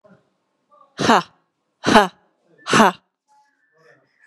{"exhalation_length": "4.3 s", "exhalation_amplitude": 32767, "exhalation_signal_mean_std_ratio": 0.28, "survey_phase": "beta (2021-08-13 to 2022-03-07)", "age": "18-44", "gender": "Female", "wearing_mask": "No", "symptom_runny_or_blocked_nose": true, "symptom_headache": true, "symptom_change_to_sense_of_smell_or_taste": true, "symptom_loss_of_taste": true, "symptom_onset": "4 days", "smoker_status": "Ex-smoker", "respiratory_condition_asthma": false, "respiratory_condition_other": false, "recruitment_source": "Test and Trace", "submission_delay": "1 day", "covid_test_result": "Positive", "covid_test_method": "RT-qPCR", "covid_ct_value": 22.8, "covid_ct_gene": "ORF1ab gene"}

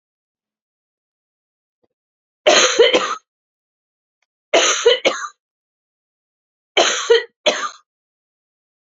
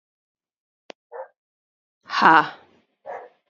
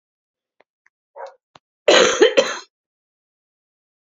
{"three_cough_length": "8.9 s", "three_cough_amplitude": 32768, "three_cough_signal_mean_std_ratio": 0.34, "exhalation_length": "3.5 s", "exhalation_amplitude": 32767, "exhalation_signal_mean_std_ratio": 0.24, "cough_length": "4.2 s", "cough_amplitude": 29770, "cough_signal_mean_std_ratio": 0.29, "survey_phase": "beta (2021-08-13 to 2022-03-07)", "age": "45-64", "gender": "Female", "wearing_mask": "No", "symptom_cough_any": true, "symptom_runny_or_blocked_nose": true, "symptom_sore_throat": true, "symptom_fatigue": true, "symptom_headache": true, "symptom_change_to_sense_of_smell_or_taste": true, "symptom_loss_of_taste": true, "symptom_onset": "5 days", "smoker_status": "Never smoked", "respiratory_condition_asthma": false, "respiratory_condition_other": false, "recruitment_source": "Test and Trace", "submission_delay": "2 days", "covid_test_result": "Positive", "covid_test_method": "RT-qPCR", "covid_ct_value": 28.6, "covid_ct_gene": "ORF1ab gene"}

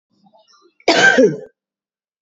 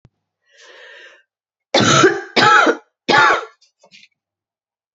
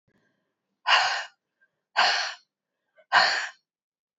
{"cough_length": "2.2 s", "cough_amplitude": 29720, "cough_signal_mean_std_ratio": 0.38, "three_cough_length": "4.9 s", "three_cough_amplitude": 29915, "three_cough_signal_mean_std_ratio": 0.41, "exhalation_length": "4.2 s", "exhalation_amplitude": 18811, "exhalation_signal_mean_std_ratio": 0.39, "survey_phase": "beta (2021-08-13 to 2022-03-07)", "age": "45-64", "gender": "Female", "wearing_mask": "No", "symptom_cough_any": true, "symptom_runny_or_blocked_nose": true, "symptom_shortness_of_breath": true, "symptom_fatigue": true, "symptom_headache": true, "symptom_change_to_sense_of_smell_or_taste": true, "symptom_other": true, "symptom_onset": "4 days", "smoker_status": "Never smoked", "respiratory_condition_asthma": false, "respiratory_condition_other": false, "recruitment_source": "Test and Trace", "submission_delay": "1 day", "covid_test_result": "Positive", "covid_test_method": "RT-qPCR", "covid_ct_value": 18.2, "covid_ct_gene": "N gene"}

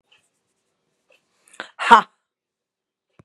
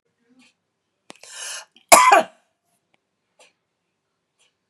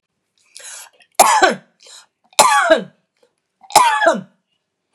{"exhalation_length": "3.2 s", "exhalation_amplitude": 32768, "exhalation_signal_mean_std_ratio": 0.16, "cough_length": "4.7 s", "cough_amplitude": 32768, "cough_signal_mean_std_ratio": 0.22, "three_cough_length": "4.9 s", "three_cough_amplitude": 32768, "three_cough_signal_mean_std_ratio": 0.4, "survey_phase": "beta (2021-08-13 to 2022-03-07)", "age": "65+", "gender": "Female", "wearing_mask": "No", "symptom_none": true, "smoker_status": "Ex-smoker", "respiratory_condition_asthma": false, "respiratory_condition_other": false, "recruitment_source": "REACT", "submission_delay": "0 days", "covid_test_result": "Negative", "covid_test_method": "RT-qPCR", "influenza_a_test_result": "Negative", "influenza_b_test_result": "Negative"}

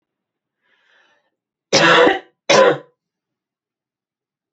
{"cough_length": "4.5 s", "cough_amplitude": 31353, "cough_signal_mean_std_ratio": 0.33, "survey_phase": "beta (2021-08-13 to 2022-03-07)", "age": "45-64", "gender": "Female", "wearing_mask": "No", "symptom_cough_any": true, "symptom_fatigue": true, "symptom_fever_high_temperature": true, "symptom_headache": true, "symptom_change_to_sense_of_smell_or_taste": true, "symptom_loss_of_taste": true, "smoker_status": "Prefer not to say", "respiratory_condition_asthma": false, "respiratory_condition_other": false, "recruitment_source": "Test and Trace", "submission_delay": "2 days", "covid_test_result": "Positive", "covid_test_method": "RT-qPCR", "covid_ct_value": 14.7, "covid_ct_gene": "ORF1ab gene", "covid_ct_mean": 14.9, "covid_viral_load": "13000000 copies/ml", "covid_viral_load_category": "High viral load (>1M copies/ml)"}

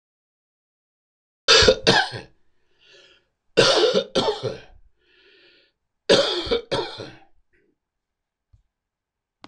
{"three_cough_length": "9.5 s", "three_cough_amplitude": 26015, "three_cough_signal_mean_std_ratio": 0.35, "survey_phase": "beta (2021-08-13 to 2022-03-07)", "age": "65+", "gender": "Male", "wearing_mask": "No", "symptom_none": true, "smoker_status": "Ex-smoker", "respiratory_condition_asthma": false, "respiratory_condition_other": false, "recruitment_source": "REACT", "submission_delay": "0 days", "covid_test_result": "Negative", "covid_test_method": "RT-qPCR", "influenza_a_test_result": "Negative", "influenza_b_test_result": "Negative"}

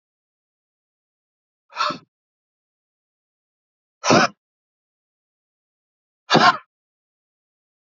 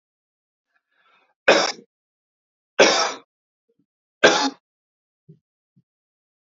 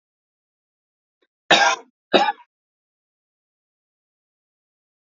{"exhalation_length": "7.9 s", "exhalation_amplitude": 31324, "exhalation_signal_mean_std_ratio": 0.21, "three_cough_length": "6.6 s", "three_cough_amplitude": 29589, "three_cough_signal_mean_std_ratio": 0.26, "cough_length": "5.0 s", "cough_amplitude": 32768, "cough_signal_mean_std_ratio": 0.22, "survey_phase": "beta (2021-08-13 to 2022-03-07)", "age": "18-44", "gender": "Male", "wearing_mask": "No", "symptom_runny_or_blocked_nose": true, "symptom_onset": "11 days", "smoker_status": "Never smoked", "respiratory_condition_asthma": false, "respiratory_condition_other": false, "recruitment_source": "REACT", "submission_delay": "1 day", "covid_test_result": "Negative", "covid_test_method": "RT-qPCR", "influenza_a_test_result": "Negative", "influenza_b_test_result": "Negative"}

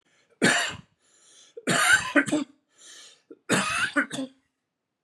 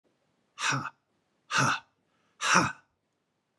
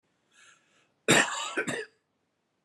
{"three_cough_length": "5.0 s", "three_cough_amplitude": 19537, "three_cough_signal_mean_std_ratio": 0.46, "exhalation_length": "3.6 s", "exhalation_amplitude": 14335, "exhalation_signal_mean_std_ratio": 0.38, "cough_length": "2.6 s", "cough_amplitude": 13207, "cough_signal_mean_std_ratio": 0.34, "survey_phase": "beta (2021-08-13 to 2022-03-07)", "age": "45-64", "gender": "Male", "wearing_mask": "No", "symptom_cough_any": true, "symptom_fatigue": true, "symptom_change_to_sense_of_smell_or_taste": true, "symptom_onset": "4 days", "smoker_status": "Never smoked", "respiratory_condition_asthma": false, "respiratory_condition_other": false, "recruitment_source": "Test and Trace", "submission_delay": "1 day", "covid_test_result": "Positive", "covid_test_method": "RT-qPCR", "covid_ct_value": 19.5, "covid_ct_gene": "ORF1ab gene"}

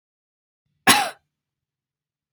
{"cough_length": "2.3 s", "cough_amplitude": 29166, "cough_signal_mean_std_ratio": 0.22, "survey_phase": "alpha (2021-03-01 to 2021-08-12)", "age": "18-44", "gender": "Female", "wearing_mask": "No", "symptom_none": true, "smoker_status": "Ex-smoker", "respiratory_condition_asthma": false, "respiratory_condition_other": false, "recruitment_source": "REACT", "submission_delay": "1 day", "covid_test_result": "Negative", "covid_test_method": "RT-qPCR"}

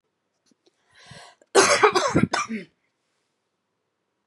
{"three_cough_length": "4.3 s", "three_cough_amplitude": 26429, "three_cough_signal_mean_std_ratio": 0.34, "survey_phase": "beta (2021-08-13 to 2022-03-07)", "age": "18-44", "gender": "Female", "wearing_mask": "No", "symptom_none": true, "smoker_status": "Ex-smoker", "respiratory_condition_asthma": false, "respiratory_condition_other": false, "recruitment_source": "REACT", "submission_delay": "14 days", "covid_test_result": "Negative", "covid_test_method": "RT-qPCR"}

